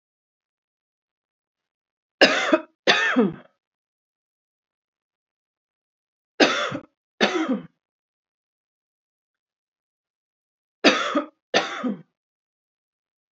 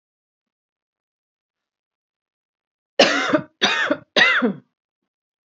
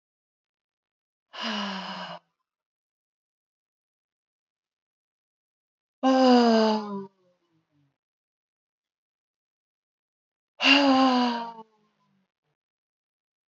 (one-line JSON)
{"three_cough_length": "13.3 s", "three_cough_amplitude": 29764, "three_cough_signal_mean_std_ratio": 0.29, "cough_length": "5.5 s", "cough_amplitude": 29426, "cough_signal_mean_std_ratio": 0.35, "exhalation_length": "13.5 s", "exhalation_amplitude": 18359, "exhalation_signal_mean_std_ratio": 0.31, "survey_phase": "beta (2021-08-13 to 2022-03-07)", "age": "45-64", "gender": "Female", "wearing_mask": "No", "symptom_none": true, "smoker_status": "Never smoked", "respiratory_condition_asthma": false, "respiratory_condition_other": false, "recruitment_source": "REACT", "submission_delay": "1 day", "covid_test_result": "Negative", "covid_test_method": "RT-qPCR", "influenza_a_test_result": "Negative", "influenza_b_test_result": "Negative"}